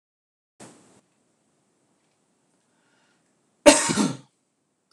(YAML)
cough_length: 4.9 s
cough_amplitude: 26028
cough_signal_mean_std_ratio: 0.2
survey_phase: beta (2021-08-13 to 2022-03-07)
age: 65+
gender: Male
wearing_mask: 'No'
symptom_none: true
smoker_status: Never smoked
respiratory_condition_asthma: false
respiratory_condition_other: false
recruitment_source: REACT
submission_delay: 1 day
covid_test_result: Negative
covid_test_method: RT-qPCR